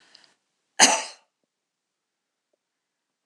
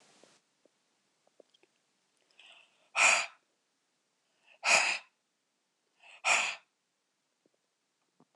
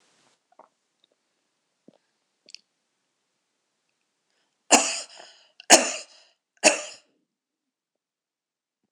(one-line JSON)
{"cough_length": "3.3 s", "cough_amplitude": 26028, "cough_signal_mean_std_ratio": 0.19, "exhalation_length": "8.4 s", "exhalation_amplitude": 10490, "exhalation_signal_mean_std_ratio": 0.26, "three_cough_length": "8.9 s", "three_cough_amplitude": 26028, "three_cough_signal_mean_std_ratio": 0.18, "survey_phase": "alpha (2021-03-01 to 2021-08-12)", "age": "65+", "gender": "Female", "wearing_mask": "No", "symptom_none": true, "smoker_status": "Never smoked", "respiratory_condition_asthma": false, "respiratory_condition_other": false, "recruitment_source": "REACT", "submission_delay": "2 days", "covid_test_result": "Negative", "covid_test_method": "RT-qPCR"}